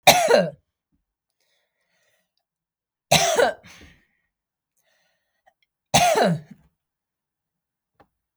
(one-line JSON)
{"three_cough_length": "8.4 s", "three_cough_amplitude": 32768, "three_cough_signal_mean_std_ratio": 0.3, "survey_phase": "beta (2021-08-13 to 2022-03-07)", "age": "65+", "gender": "Female", "wearing_mask": "No", "symptom_none": true, "smoker_status": "Never smoked", "respiratory_condition_asthma": false, "respiratory_condition_other": false, "recruitment_source": "REACT", "submission_delay": "3 days", "covid_test_result": "Negative", "covid_test_method": "RT-qPCR", "influenza_a_test_result": "Negative", "influenza_b_test_result": "Negative"}